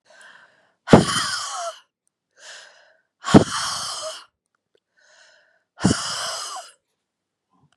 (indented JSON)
{
  "exhalation_length": "7.8 s",
  "exhalation_amplitude": 32768,
  "exhalation_signal_mean_std_ratio": 0.3,
  "survey_phase": "beta (2021-08-13 to 2022-03-07)",
  "age": "65+",
  "gender": "Female",
  "wearing_mask": "No",
  "symptom_cough_any": true,
  "symptom_runny_or_blocked_nose": true,
  "symptom_sore_throat": true,
  "smoker_status": "Ex-smoker",
  "respiratory_condition_asthma": false,
  "respiratory_condition_other": false,
  "recruitment_source": "Test and Trace",
  "submission_delay": "2 days",
  "covid_test_result": "Positive",
  "covid_test_method": "RT-qPCR"
}